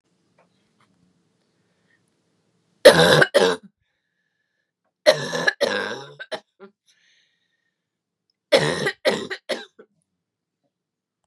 three_cough_length: 11.3 s
three_cough_amplitude: 32768
three_cough_signal_mean_std_ratio: 0.28
survey_phase: beta (2021-08-13 to 2022-03-07)
age: 18-44
gender: Female
wearing_mask: 'No'
symptom_cough_any: true
symptom_shortness_of_breath: true
symptom_sore_throat: true
symptom_fatigue: true
symptom_headache: true
symptom_other: true
smoker_status: Never smoked
respiratory_condition_asthma: false
respiratory_condition_other: false
recruitment_source: Test and Trace
submission_delay: 1 day
covid_test_result: Positive
covid_test_method: LFT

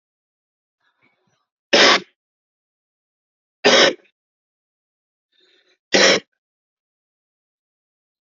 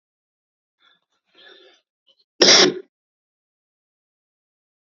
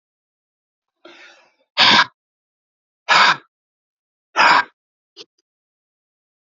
three_cough_length: 8.4 s
three_cough_amplitude: 30623
three_cough_signal_mean_std_ratio: 0.25
cough_length: 4.9 s
cough_amplitude: 32767
cough_signal_mean_std_ratio: 0.21
exhalation_length: 6.5 s
exhalation_amplitude: 30995
exhalation_signal_mean_std_ratio: 0.28
survey_phase: alpha (2021-03-01 to 2021-08-12)
age: 45-64
gender: Male
wearing_mask: 'Yes'
symptom_none: true
smoker_status: Current smoker (1 to 10 cigarettes per day)
respiratory_condition_asthma: false
respiratory_condition_other: false
recruitment_source: REACT
submission_delay: 3 days
covid_test_result: Negative
covid_test_method: RT-qPCR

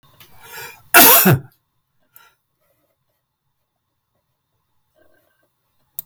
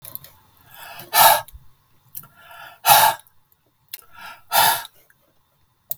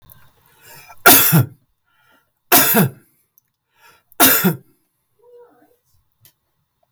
cough_length: 6.1 s
cough_amplitude: 32768
cough_signal_mean_std_ratio: 0.24
exhalation_length: 6.0 s
exhalation_amplitude: 32768
exhalation_signal_mean_std_ratio: 0.33
three_cough_length: 6.9 s
three_cough_amplitude: 32768
three_cough_signal_mean_std_ratio: 0.34
survey_phase: beta (2021-08-13 to 2022-03-07)
age: 65+
gender: Male
wearing_mask: 'No'
symptom_none: true
smoker_status: Ex-smoker
respiratory_condition_asthma: false
respiratory_condition_other: false
recruitment_source: REACT
submission_delay: 1 day
covid_test_result: Negative
covid_test_method: RT-qPCR
influenza_a_test_result: Negative
influenza_b_test_result: Negative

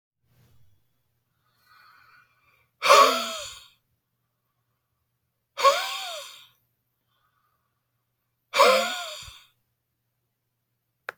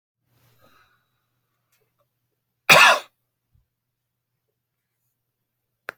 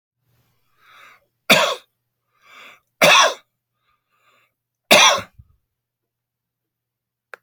exhalation_length: 11.2 s
exhalation_amplitude: 25161
exhalation_signal_mean_std_ratio: 0.26
cough_length: 6.0 s
cough_amplitude: 31079
cough_signal_mean_std_ratio: 0.17
three_cough_length: 7.4 s
three_cough_amplitude: 32006
three_cough_signal_mean_std_ratio: 0.27
survey_phase: beta (2021-08-13 to 2022-03-07)
age: 45-64
gender: Male
wearing_mask: 'No'
symptom_cough_any: true
symptom_shortness_of_breath: true
smoker_status: Never smoked
respiratory_condition_asthma: true
respiratory_condition_other: true
recruitment_source: REACT
submission_delay: 5 days
covid_test_result: Negative
covid_test_method: RT-qPCR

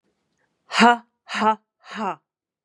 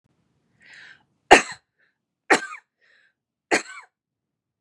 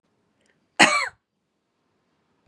exhalation_length: 2.6 s
exhalation_amplitude: 30458
exhalation_signal_mean_std_ratio: 0.33
three_cough_length: 4.6 s
three_cough_amplitude: 32768
three_cough_signal_mean_std_ratio: 0.19
cough_length: 2.5 s
cough_amplitude: 32503
cough_signal_mean_std_ratio: 0.23
survey_phase: beta (2021-08-13 to 2022-03-07)
age: 45-64
gender: Female
wearing_mask: 'No'
symptom_none: true
smoker_status: Never smoked
respiratory_condition_asthma: false
respiratory_condition_other: false
recruitment_source: Test and Trace
submission_delay: -1 day
covid_test_result: Negative
covid_test_method: LFT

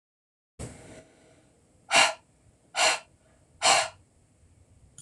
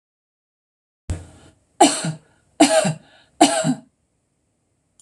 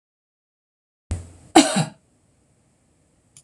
exhalation_length: 5.0 s
exhalation_amplitude: 18289
exhalation_signal_mean_std_ratio: 0.31
three_cough_length: 5.0 s
three_cough_amplitude: 26028
three_cough_signal_mean_std_ratio: 0.33
cough_length: 3.4 s
cough_amplitude: 26028
cough_signal_mean_std_ratio: 0.22
survey_phase: alpha (2021-03-01 to 2021-08-12)
age: 45-64
gender: Female
wearing_mask: 'No'
symptom_none: true
smoker_status: Never smoked
respiratory_condition_asthma: false
respiratory_condition_other: false
recruitment_source: REACT
submission_delay: 12 days
covid_test_result: Negative
covid_test_method: RT-qPCR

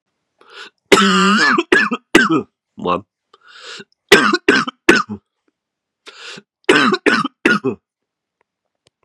three_cough_length: 9.0 s
three_cough_amplitude: 32768
three_cough_signal_mean_std_ratio: 0.45
survey_phase: beta (2021-08-13 to 2022-03-07)
age: 18-44
gender: Male
wearing_mask: 'No'
symptom_cough_any: true
symptom_runny_or_blocked_nose: true
symptom_headache: true
symptom_onset: 3 days
smoker_status: Never smoked
respiratory_condition_asthma: false
respiratory_condition_other: false
recruitment_source: Test and Trace
submission_delay: 2 days
covid_test_result: Positive
covid_test_method: RT-qPCR
covid_ct_value: 23.1
covid_ct_gene: N gene
covid_ct_mean: 23.7
covid_viral_load: 17000 copies/ml
covid_viral_load_category: Low viral load (10K-1M copies/ml)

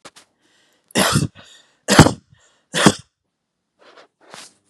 three_cough_length: 4.7 s
three_cough_amplitude: 32768
three_cough_signal_mean_std_ratio: 0.28
survey_phase: beta (2021-08-13 to 2022-03-07)
age: 18-44
gender: Female
wearing_mask: 'No'
symptom_none: true
smoker_status: Never smoked
respiratory_condition_asthma: false
respiratory_condition_other: false
recruitment_source: REACT
submission_delay: 2 days
covid_test_result: Negative
covid_test_method: RT-qPCR
influenza_a_test_result: Negative
influenza_b_test_result: Negative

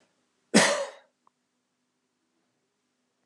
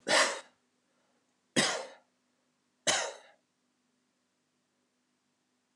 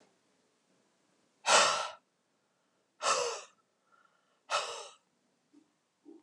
cough_length: 3.3 s
cough_amplitude: 18450
cough_signal_mean_std_ratio: 0.23
three_cough_length: 5.8 s
three_cough_amplitude: 8983
three_cough_signal_mean_std_ratio: 0.28
exhalation_length: 6.2 s
exhalation_amplitude: 8723
exhalation_signal_mean_std_ratio: 0.3
survey_phase: beta (2021-08-13 to 2022-03-07)
age: 45-64
gender: Male
wearing_mask: 'No'
symptom_none: true
smoker_status: Never smoked
respiratory_condition_asthma: false
respiratory_condition_other: false
recruitment_source: REACT
submission_delay: 2 days
covid_test_result: Negative
covid_test_method: RT-qPCR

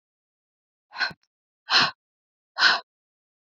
exhalation_length: 3.5 s
exhalation_amplitude: 19712
exhalation_signal_mean_std_ratio: 0.29
survey_phase: beta (2021-08-13 to 2022-03-07)
age: 18-44
gender: Female
wearing_mask: 'No'
symptom_runny_or_blocked_nose: true
symptom_sore_throat: true
symptom_fatigue: true
symptom_headache: true
symptom_change_to_sense_of_smell_or_taste: true
symptom_loss_of_taste: true
smoker_status: Never smoked
respiratory_condition_asthma: false
respiratory_condition_other: false
recruitment_source: Test and Trace
submission_delay: 2 days
covid_test_result: Positive
covid_test_method: RT-qPCR
covid_ct_value: 15.4
covid_ct_gene: ORF1ab gene
covid_ct_mean: 15.6
covid_viral_load: 7900000 copies/ml
covid_viral_load_category: High viral load (>1M copies/ml)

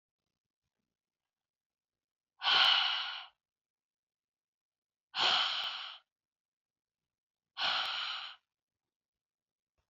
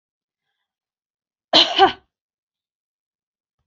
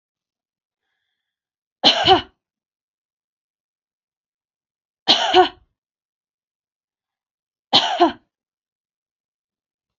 exhalation_length: 9.9 s
exhalation_amplitude: 7263
exhalation_signal_mean_std_ratio: 0.34
cough_length: 3.7 s
cough_amplitude: 30151
cough_signal_mean_std_ratio: 0.22
three_cough_length: 10.0 s
three_cough_amplitude: 31798
three_cough_signal_mean_std_ratio: 0.24
survey_phase: beta (2021-08-13 to 2022-03-07)
age: 45-64
gender: Female
wearing_mask: 'No'
symptom_none: true
smoker_status: Never smoked
respiratory_condition_asthma: false
respiratory_condition_other: false
recruitment_source: REACT
submission_delay: 2 days
covid_test_result: Negative
covid_test_method: RT-qPCR
influenza_a_test_result: Negative
influenza_b_test_result: Negative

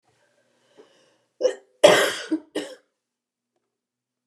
cough_length: 4.3 s
cough_amplitude: 29203
cough_signal_mean_std_ratio: 0.26
survey_phase: beta (2021-08-13 to 2022-03-07)
age: 65+
gender: Female
wearing_mask: 'No'
symptom_none: true
smoker_status: Never smoked
respiratory_condition_asthma: false
respiratory_condition_other: false
recruitment_source: REACT
submission_delay: 0 days
covid_test_result: Negative
covid_test_method: RT-qPCR
influenza_a_test_result: Negative
influenza_b_test_result: Negative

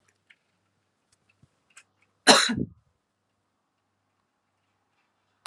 cough_length: 5.5 s
cough_amplitude: 28878
cough_signal_mean_std_ratio: 0.18
survey_phase: alpha (2021-03-01 to 2021-08-12)
age: 65+
gender: Female
wearing_mask: 'No'
symptom_diarrhoea: true
smoker_status: Ex-smoker
respiratory_condition_asthma: false
respiratory_condition_other: false
recruitment_source: Test and Trace
submission_delay: 1 day
covid_test_result: Positive
covid_test_method: RT-qPCR
covid_ct_value: 36.3
covid_ct_gene: ORF1ab gene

